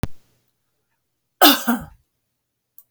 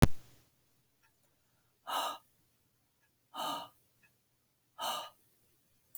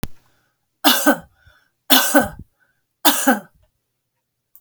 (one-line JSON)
{"cough_length": "2.9 s", "cough_amplitude": 32768, "cough_signal_mean_std_ratio": 0.27, "exhalation_length": "6.0 s", "exhalation_amplitude": 16067, "exhalation_signal_mean_std_ratio": 0.25, "three_cough_length": "4.6 s", "three_cough_amplitude": 32768, "three_cough_signal_mean_std_ratio": 0.36, "survey_phase": "alpha (2021-03-01 to 2021-08-12)", "age": "65+", "gender": "Female", "wearing_mask": "No", "symptom_none": true, "smoker_status": "Never smoked", "respiratory_condition_asthma": false, "respiratory_condition_other": false, "recruitment_source": "REACT", "submission_delay": "1 day", "covid_test_result": "Negative", "covid_test_method": "RT-qPCR"}